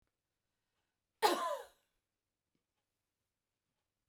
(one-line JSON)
{"cough_length": "4.1 s", "cough_amplitude": 5079, "cough_signal_mean_std_ratio": 0.22, "survey_phase": "beta (2021-08-13 to 2022-03-07)", "age": "65+", "gender": "Female", "wearing_mask": "No", "symptom_none": true, "smoker_status": "Ex-smoker", "respiratory_condition_asthma": true, "respiratory_condition_other": false, "recruitment_source": "REACT", "submission_delay": "1 day", "covid_test_result": "Negative", "covid_test_method": "RT-qPCR"}